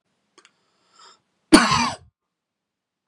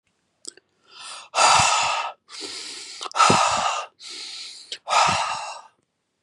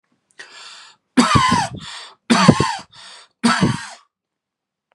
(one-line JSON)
{"cough_length": "3.1 s", "cough_amplitude": 32768, "cough_signal_mean_std_ratio": 0.24, "exhalation_length": "6.2 s", "exhalation_amplitude": 24973, "exhalation_signal_mean_std_ratio": 0.52, "three_cough_length": "4.9 s", "three_cough_amplitude": 32768, "three_cough_signal_mean_std_ratio": 0.43, "survey_phase": "beta (2021-08-13 to 2022-03-07)", "age": "18-44", "gender": "Male", "wearing_mask": "No", "symptom_fatigue": true, "symptom_onset": "2 days", "smoker_status": "Prefer not to say", "recruitment_source": "REACT", "submission_delay": "2 days", "covid_test_result": "Negative", "covid_test_method": "RT-qPCR", "influenza_a_test_result": "Negative", "influenza_b_test_result": "Negative"}